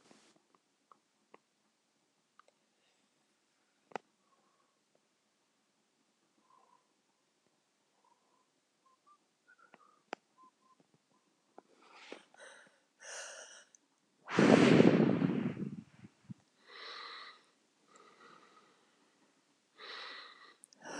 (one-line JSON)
{"exhalation_length": "21.0 s", "exhalation_amplitude": 12029, "exhalation_signal_mean_std_ratio": 0.21, "survey_phase": "beta (2021-08-13 to 2022-03-07)", "age": "65+", "gender": "Female", "wearing_mask": "No", "symptom_cough_any": true, "symptom_shortness_of_breath": true, "symptom_diarrhoea": true, "symptom_change_to_sense_of_smell_or_taste": true, "symptom_loss_of_taste": true, "smoker_status": "Never smoked", "respiratory_condition_asthma": false, "respiratory_condition_other": true, "recruitment_source": "REACT", "submission_delay": "8 days", "covid_test_result": "Negative", "covid_test_method": "RT-qPCR", "influenza_a_test_result": "Negative", "influenza_b_test_result": "Negative"}